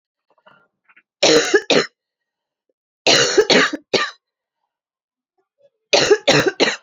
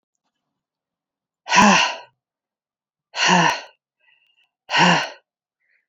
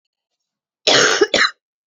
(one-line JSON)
{"three_cough_length": "6.8 s", "three_cough_amplitude": 32240, "three_cough_signal_mean_std_ratio": 0.42, "exhalation_length": "5.9 s", "exhalation_amplitude": 27736, "exhalation_signal_mean_std_ratio": 0.36, "cough_length": "1.9 s", "cough_amplitude": 31845, "cough_signal_mean_std_ratio": 0.44, "survey_phase": "beta (2021-08-13 to 2022-03-07)", "age": "18-44", "gender": "Female", "wearing_mask": "No", "symptom_cough_any": true, "symptom_runny_or_blocked_nose": true, "symptom_shortness_of_breath": true, "symptom_sore_throat": true, "symptom_fatigue": true, "symptom_headache": true, "symptom_change_to_sense_of_smell_or_taste": true, "symptom_loss_of_taste": true, "symptom_onset": "4 days", "smoker_status": "Current smoker (e-cigarettes or vapes only)", "respiratory_condition_asthma": false, "respiratory_condition_other": false, "recruitment_source": "Test and Trace", "submission_delay": "3 days", "covid_test_result": "Positive", "covid_test_method": "RT-qPCR"}